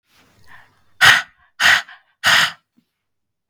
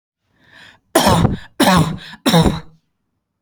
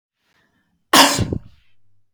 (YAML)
exhalation_length: 3.5 s
exhalation_amplitude: 32065
exhalation_signal_mean_std_ratio: 0.35
three_cough_length: 3.4 s
three_cough_amplitude: 32768
three_cough_signal_mean_std_ratio: 0.48
cough_length: 2.1 s
cough_amplitude: 31589
cough_signal_mean_std_ratio: 0.32
survey_phase: beta (2021-08-13 to 2022-03-07)
age: 18-44
gender: Female
wearing_mask: 'No'
symptom_none: true
smoker_status: Ex-smoker
respiratory_condition_asthma: false
respiratory_condition_other: false
recruitment_source: REACT
submission_delay: 1 day
covid_test_result: Negative
covid_test_method: RT-qPCR